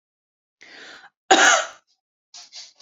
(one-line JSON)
{"cough_length": "2.8 s", "cough_amplitude": 31665, "cough_signal_mean_std_ratio": 0.3, "survey_phase": "beta (2021-08-13 to 2022-03-07)", "age": "45-64", "gender": "Female", "wearing_mask": "No", "symptom_fatigue": true, "symptom_onset": "13 days", "smoker_status": "Ex-smoker", "respiratory_condition_asthma": false, "respiratory_condition_other": false, "recruitment_source": "REACT", "submission_delay": "3 days", "covid_test_result": "Negative", "covid_test_method": "RT-qPCR"}